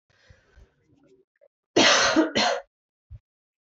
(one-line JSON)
{"cough_length": "3.7 s", "cough_amplitude": 21802, "cough_signal_mean_std_ratio": 0.38, "survey_phase": "beta (2021-08-13 to 2022-03-07)", "age": "18-44", "gender": "Female", "wearing_mask": "No", "symptom_cough_any": true, "symptom_new_continuous_cough": true, "symptom_runny_or_blocked_nose": true, "symptom_onset": "4 days", "smoker_status": "Never smoked", "respiratory_condition_asthma": false, "respiratory_condition_other": false, "recruitment_source": "Test and Trace", "submission_delay": "2 days", "covid_test_result": "Positive", "covid_test_method": "RT-qPCR", "covid_ct_value": 19.9, "covid_ct_gene": "ORF1ab gene", "covid_ct_mean": 20.2, "covid_viral_load": "240000 copies/ml", "covid_viral_load_category": "Low viral load (10K-1M copies/ml)"}